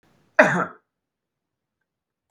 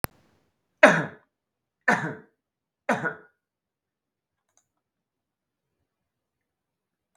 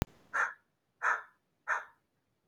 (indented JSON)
{
  "cough_length": "2.3 s",
  "cough_amplitude": 32768,
  "cough_signal_mean_std_ratio": 0.23,
  "three_cough_length": "7.2 s",
  "three_cough_amplitude": 32768,
  "three_cough_signal_mean_std_ratio": 0.19,
  "exhalation_length": "2.5 s",
  "exhalation_amplitude": 6307,
  "exhalation_signal_mean_std_ratio": 0.36,
  "survey_phase": "beta (2021-08-13 to 2022-03-07)",
  "age": "18-44",
  "gender": "Male",
  "wearing_mask": "No",
  "symptom_none": true,
  "smoker_status": "Never smoked",
  "respiratory_condition_asthma": false,
  "respiratory_condition_other": false,
  "recruitment_source": "REACT",
  "submission_delay": "3 days",
  "covid_test_result": "Negative",
  "covid_test_method": "RT-qPCR"
}